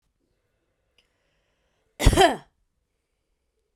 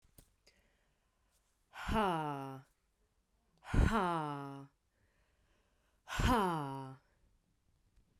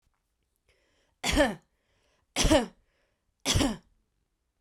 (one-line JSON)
{"cough_length": "3.8 s", "cough_amplitude": 26808, "cough_signal_mean_std_ratio": 0.21, "exhalation_length": "8.2 s", "exhalation_amplitude": 3870, "exhalation_signal_mean_std_ratio": 0.41, "three_cough_length": "4.6 s", "three_cough_amplitude": 10176, "three_cough_signal_mean_std_ratio": 0.34, "survey_phase": "beta (2021-08-13 to 2022-03-07)", "age": "18-44", "gender": "Female", "wearing_mask": "No", "symptom_runny_or_blocked_nose": true, "symptom_fatigue": true, "symptom_headache": true, "smoker_status": "Never smoked", "respiratory_condition_asthma": false, "respiratory_condition_other": false, "recruitment_source": "Test and Trace", "submission_delay": "2 days", "covid_test_result": "Positive", "covid_test_method": "RT-qPCR", "covid_ct_value": 16.2, "covid_ct_gene": "N gene", "covid_ct_mean": 19.0, "covid_viral_load": "590000 copies/ml", "covid_viral_load_category": "Low viral load (10K-1M copies/ml)"}